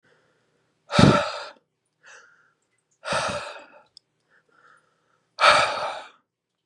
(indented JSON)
{
  "exhalation_length": "6.7 s",
  "exhalation_amplitude": 29199,
  "exhalation_signal_mean_std_ratio": 0.31,
  "survey_phase": "beta (2021-08-13 to 2022-03-07)",
  "age": "18-44",
  "gender": "Male",
  "wearing_mask": "No",
  "symptom_cough_any": true,
  "symptom_runny_or_blocked_nose": true,
  "symptom_sore_throat": true,
  "symptom_diarrhoea": true,
  "symptom_fatigue": true,
  "symptom_onset": "3 days",
  "smoker_status": "Never smoked",
  "respiratory_condition_asthma": false,
  "respiratory_condition_other": false,
  "recruitment_source": "Test and Trace",
  "submission_delay": "1 day",
  "covid_test_result": "Negative",
  "covid_test_method": "RT-qPCR"
}